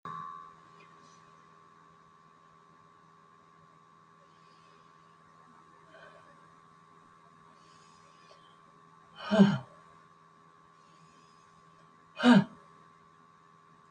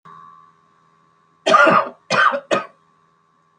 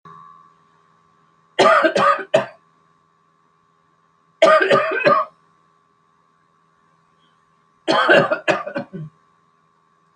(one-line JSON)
{"exhalation_length": "13.9 s", "exhalation_amplitude": 11052, "exhalation_signal_mean_std_ratio": 0.21, "cough_length": "3.6 s", "cough_amplitude": 28326, "cough_signal_mean_std_ratio": 0.39, "three_cough_length": "10.2 s", "three_cough_amplitude": 28785, "three_cough_signal_mean_std_ratio": 0.38, "survey_phase": "beta (2021-08-13 to 2022-03-07)", "age": "65+", "gender": "Female", "wearing_mask": "No", "symptom_cough_any": true, "smoker_status": "Never smoked", "respiratory_condition_asthma": false, "respiratory_condition_other": false, "recruitment_source": "REACT", "submission_delay": "1 day", "covid_test_result": "Negative", "covid_test_method": "RT-qPCR"}